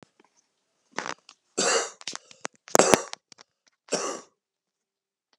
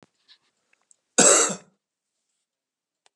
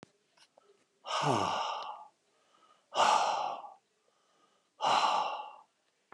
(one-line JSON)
{"three_cough_length": "5.4 s", "three_cough_amplitude": 32768, "three_cough_signal_mean_std_ratio": 0.26, "cough_length": "3.2 s", "cough_amplitude": 26780, "cough_signal_mean_std_ratio": 0.26, "exhalation_length": "6.1 s", "exhalation_amplitude": 6193, "exhalation_signal_mean_std_ratio": 0.48, "survey_phase": "beta (2021-08-13 to 2022-03-07)", "age": "65+", "gender": "Male", "wearing_mask": "No", "symptom_cough_any": true, "symptom_runny_or_blocked_nose": true, "symptom_onset": "5 days", "smoker_status": "Never smoked", "respiratory_condition_asthma": true, "respiratory_condition_other": false, "recruitment_source": "Test and Trace", "submission_delay": "2 days", "covid_test_result": "Positive", "covid_test_method": "RT-qPCR"}